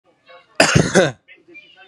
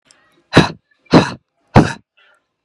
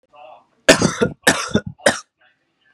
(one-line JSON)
{"cough_length": "1.9 s", "cough_amplitude": 32768, "cough_signal_mean_std_ratio": 0.39, "exhalation_length": "2.6 s", "exhalation_amplitude": 32768, "exhalation_signal_mean_std_ratio": 0.31, "three_cough_length": "2.7 s", "three_cough_amplitude": 32768, "three_cough_signal_mean_std_ratio": 0.36, "survey_phase": "beta (2021-08-13 to 2022-03-07)", "age": "18-44", "gender": "Male", "wearing_mask": "No", "symptom_headache": true, "symptom_onset": "12 days", "smoker_status": "Current smoker (1 to 10 cigarettes per day)", "respiratory_condition_asthma": false, "respiratory_condition_other": false, "recruitment_source": "REACT", "submission_delay": "1 day", "covid_test_result": "Negative", "covid_test_method": "RT-qPCR", "influenza_a_test_result": "Negative", "influenza_b_test_result": "Negative"}